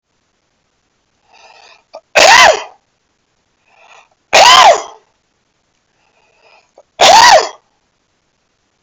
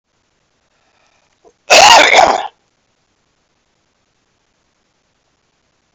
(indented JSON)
{
  "three_cough_length": "8.8 s",
  "three_cough_amplitude": 32768,
  "three_cough_signal_mean_std_ratio": 0.35,
  "cough_length": "5.9 s",
  "cough_amplitude": 32768,
  "cough_signal_mean_std_ratio": 0.28,
  "survey_phase": "beta (2021-08-13 to 2022-03-07)",
  "age": "45-64",
  "gender": "Male",
  "wearing_mask": "No",
  "symptom_none": true,
  "smoker_status": "Ex-smoker",
  "respiratory_condition_asthma": false,
  "respiratory_condition_other": true,
  "recruitment_source": "REACT",
  "submission_delay": "1 day",
  "covid_test_result": "Negative",
  "covid_test_method": "RT-qPCR",
  "influenza_a_test_result": "Unknown/Void",
  "influenza_b_test_result": "Unknown/Void"
}